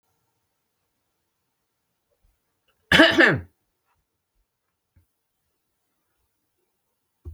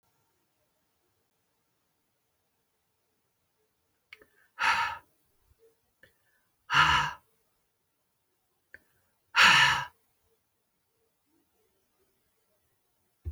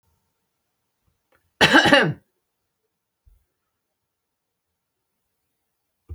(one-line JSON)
{"cough_length": "7.3 s", "cough_amplitude": 27375, "cough_signal_mean_std_ratio": 0.19, "exhalation_length": "13.3 s", "exhalation_amplitude": 14352, "exhalation_signal_mean_std_ratio": 0.23, "three_cough_length": "6.1 s", "three_cough_amplitude": 29722, "three_cough_signal_mean_std_ratio": 0.22, "survey_phase": "alpha (2021-03-01 to 2021-08-12)", "age": "65+", "gender": "Female", "wearing_mask": "No", "symptom_none": true, "smoker_status": "Never smoked", "respiratory_condition_asthma": false, "respiratory_condition_other": false, "recruitment_source": "REACT", "submission_delay": "3 days", "covid_test_result": "Negative", "covid_test_method": "RT-qPCR"}